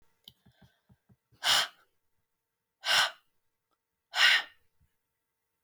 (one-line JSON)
{"exhalation_length": "5.6 s", "exhalation_amplitude": 10120, "exhalation_signal_mean_std_ratio": 0.29, "survey_phase": "beta (2021-08-13 to 2022-03-07)", "age": "45-64", "gender": "Female", "wearing_mask": "No", "symptom_none": true, "smoker_status": "Never smoked", "respiratory_condition_asthma": false, "respiratory_condition_other": false, "recruitment_source": "REACT", "submission_delay": "1 day", "covid_test_result": "Negative", "covid_test_method": "RT-qPCR"}